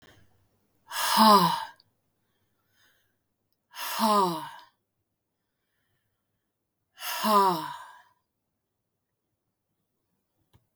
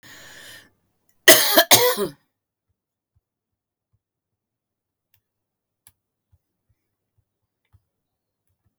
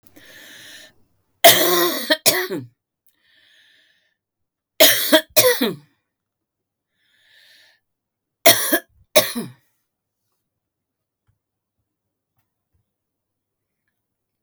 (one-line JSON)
{"exhalation_length": "10.8 s", "exhalation_amplitude": 15235, "exhalation_signal_mean_std_ratio": 0.32, "cough_length": "8.8 s", "cough_amplitude": 32768, "cough_signal_mean_std_ratio": 0.2, "three_cough_length": "14.4 s", "three_cough_amplitude": 32768, "three_cough_signal_mean_std_ratio": 0.28, "survey_phase": "beta (2021-08-13 to 2022-03-07)", "age": "65+", "gender": "Female", "wearing_mask": "No", "symptom_none": true, "smoker_status": "Ex-smoker", "respiratory_condition_asthma": false, "respiratory_condition_other": false, "recruitment_source": "REACT", "submission_delay": "2 days", "covid_test_result": "Negative", "covid_test_method": "RT-qPCR"}